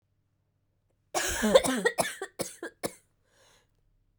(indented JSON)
{
  "cough_length": "4.2 s",
  "cough_amplitude": 17769,
  "cough_signal_mean_std_ratio": 0.35,
  "survey_phase": "beta (2021-08-13 to 2022-03-07)",
  "age": "18-44",
  "gender": "Female",
  "wearing_mask": "No",
  "symptom_cough_any": true,
  "symptom_runny_or_blocked_nose": true,
  "symptom_shortness_of_breath": true,
  "symptom_sore_throat": true,
  "symptom_fatigue": true,
  "symptom_headache": true,
  "symptom_change_to_sense_of_smell_or_taste": true,
  "smoker_status": "Never smoked",
  "respiratory_condition_asthma": false,
  "respiratory_condition_other": false,
  "recruitment_source": "Test and Trace",
  "submission_delay": "2 days",
  "covid_test_result": "Positive",
  "covid_test_method": "LFT"
}